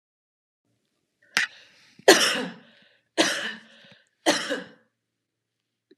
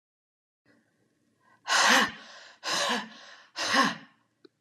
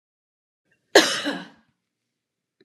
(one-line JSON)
{"three_cough_length": "6.0 s", "three_cough_amplitude": 32115, "three_cough_signal_mean_std_ratio": 0.29, "exhalation_length": "4.6 s", "exhalation_amplitude": 13191, "exhalation_signal_mean_std_ratio": 0.42, "cough_length": "2.6 s", "cough_amplitude": 30451, "cough_signal_mean_std_ratio": 0.24, "survey_phase": "beta (2021-08-13 to 2022-03-07)", "age": "45-64", "gender": "Female", "wearing_mask": "No", "symptom_none": true, "smoker_status": "Never smoked", "respiratory_condition_asthma": false, "respiratory_condition_other": false, "recruitment_source": "REACT", "submission_delay": "1 day", "covid_test_result": "Negative", "covid_test_method": "RT-qPCR"}